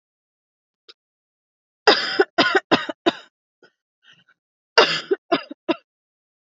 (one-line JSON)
{"cough_length": "6.6 s", "cough_amplitude": 28972, "cough_signal_mean_std_ratio": 0.3, "survey_phase": "alpha (2021-03-01 to 2021-08-12)", "age": "18-44", "gender": "Female", "wearing_mask": "No", "symptom_none": true, "symptom_onset": "3 days", "smoker_status": "Never smoked", "respiratory_condition_asthma": false, "respiratory_condition_other": false, "recruitment_source": "REACT", "submission_delay": "2 days", "covid_test_result": "Negative", "covid_test_method": "RT-qPCR"}